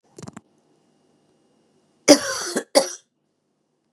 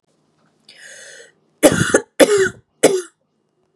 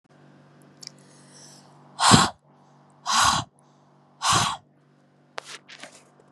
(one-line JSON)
{"cough_length": "3.9 s", "cough_amplitude": 32767, "cough_signal_mean_std_ratio": 0.23, "three_cough_length": "3.8 s", "three_cough_amplitude": 32768, "three_cough_signal_mean_std_ratio": 0.36, "exhalation_length": "6.3 s", "exhalation_amplitude": 31881, "exhalation_signal_mean_std_ratio": 0.33, "survey_phase": "beta (2021-08-13 to 2022-03-07)", "age": "18-44", "gender": "Female", "wearing_mask": "No", "symptom_sore_throat": true, "symptom_onset": "3 days", "smoker_status": "Ex-smoker", "respiratory_condition_asthma": false, "respiratory_condition_other": false, "recruitment_source": "Test and Trace", "submission_delay": "2 days", "covid_test_result": "Positive", "covid_test_method": "RT-qPCR", "covid_ct_value": 21.1, "covid_ct_gene": "ORF1ab gene"}